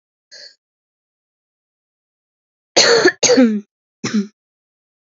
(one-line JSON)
{"cough_length": "5.0 s", "cough_amplitude": 30844, "cough_signal_mean_std_ratio": 0.35, "survey_phase": "alpha (2021-03-01 to 2021-08-12)", "age": "18-44", "gender": "Female", "wearing_mask": "No", "symptom_new_continuous_cough": true, "symptom_shortness_of_breath": true, "symptom_fatigue": true, "symptom_headache": true, "symptom_onset": "6 days", "smoker_status": "Never smoked", "respiratory_condition_asthma": true, "respiratory_condition_other": false, "recruitment_source": "Test and Trace", "submission_delay": "2 days", "covid_test_result": "Positive", "covid_test_method": "RT-qPCR", "covid_ct_value": 36.4, "covid_ct_gene": "N gene"}